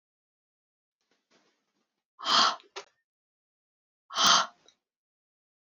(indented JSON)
{
  "exhalation_length": "5.7 s",
  "exhalation_amplitude": 13120,
  "exhalation_signal_mean_std_ratio": 0.26,
  "survey_phase": "beta (2021-08-13 to 2022-03-07)",
  "age": "18-44",
  "gender": "Female",
  "wearing_mask": "No",
  "symptom_cough_any": true,
  "symptom_runny_or_blocked_nose": true,
  "symptom_sore_throat": true,
  "symptom_fever_high_temperature": true,
  "symptom_headache": true,
  "symptom_onset": "2 days",
  "smoker_status": "Never smoked",
  "respiratory_condition_asthma": false,
  "respiratory_condition_other": false,
  "recruitment_source": "Test and Trace",
  "submission_delay": "2 days",
  "covid_test_result": "Positive",
  "covid_test_method": "ePCR"
}